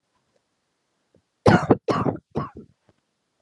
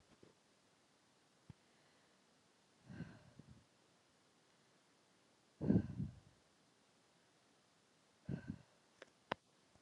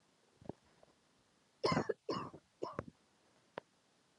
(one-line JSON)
{"cough_length": "3.4 s", "cough_amplitude": 29358, "cough_signal_mean_std_ratio": 0.3, "exhalation_length": "9.8 s", "exhalation_amplitude": 3964, "exhalation_signal_mean_std_ratio": 0.23, "three_cough_length": "4.2 s", "three_cough_amplitude": 2846, "three_cough_signal_mean_std_ratio": 0.3, "survey_phase": "alpha (2021-03-01 to 2021-08-12)", "age": "18-44", "gender": "Female", "wearing_mask": "No", "symptom_shortness_of_breath": true, "symptom_fatigue": true, "symptom_headache": true, "symptom_change_to_sense_of_smell_or_taste": true, "smoker_status": "Never smoked", "respiratory_condition_asthma": false, "respiratory_condition_other": false, "recruitment_source": "Test and Trace", "submission_delay": "1 day", "covid_test_result": "Positive", "covid_test_method": "RT-qPCR"}